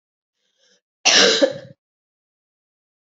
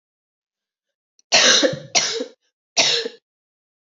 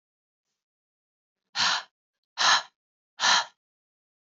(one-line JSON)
{"cough_length": "3.1 s", "cough_amplitude": 28764, "cough_signal_mean_std_ratio": 0.31, "three_cough_length": "3.8 s", "three_cough_amplitude": 29539, "three_cough_signal_mean_std_ratio": 0.4, "exhalation_length": "4.3 s", "exhalation_amplitude": 13378, "exhalation_signal_mean_std_ratio": 0.32, "survey_phase": "beta (2021-08-13 to 2022-03-07)", "age": "18-44", "gender": "Female", "wearing_mask": "No", "symptom_cough_any": true, "symptom_runny_or_blocked_nose": true, "symptom_sore_throat": true, "symptom_headache": true, "smoker_status": "Never smoked", "respiratory_condition_asthma": false, "respiratory_condition_other": false, "recruitment_source": "Test and Trace", "submission_delay": "2 days", "covid_test_result": "Positive", "covid_test_method": "LFT"}